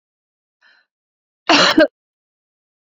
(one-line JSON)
{"cough_length": "3.0 s", "cough_amplitude": 29938, "cough_signal_mean_std_ratio": 0.28, "survey_phase": "beta (2021-08-13 to 2022-03-07)", "age": "45-64", "gender": "Female", "wearing_mask": "No", "symptom_none": true, "smoker_status": "Ex-smoker", "respiratory_condition_asthma": false, "respiratory_condition_other": false, "recruitment_source": "REACT", "submission_delay": "2 days", "covid_test_result": "Negative", "covid_test_method": "RT-qPCR", "influenza_a_test_result": "Negative", "influenza_b_test_result": "Negative"}